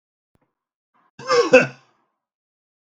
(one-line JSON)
{"cough_length": "2.8 s", "cough_amplitude": 32768, "cough_signal_mean_std_ratio": 0.26, "survey_phase": "beta (2021-08-13 to 2022-03-07)", "age": "45-64", "gender": "Male", "wearing_mask": "No", "symptom_none": true, "smoker_status": "Ex-smoker", "respiratory_condition_asthma": false, "respiratory_condition_other": false, "recruitment_source": "REACT", "submission_delay": "0 days", "covid_test_result": "Negative", "covid_test_method": "RT-qPCR", "influenza_a_test_result": "Negative", "influenza_b_test_result": "Negative"}